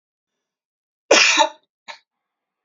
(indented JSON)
{
  "cough_length": "2.6 s",
  "cough_amplitude": 30192,
  "cough_signal_mean_std_ratio": 0.3,
  "survey_phase": "beta (2021-08-13 to 2022-03-07)",
  "age": "18-44",
  "gender": "Female",
  "wearing_mask": "No",
  "symptom_cough_any": true,
  "symptom_runny_or_blocked_nose": true,
  "symptom_change_to_sense_of_smell_or_taste": true,
  "symptom_onset": "12 days",
  "smoker_status": "Never smoked",
  "respiratory_condition_asthma": true,
  "respiratory_condition_other": false,
  "recruitment_source": "REACT",
  "submission_delay": "1 day",
  "covid_test_result": "Negative",
  "covid_test_method": "RT-qPCR",
  "influenza_a_test_result": "Negative",
  "influenza_b_test_result": "Negative"
}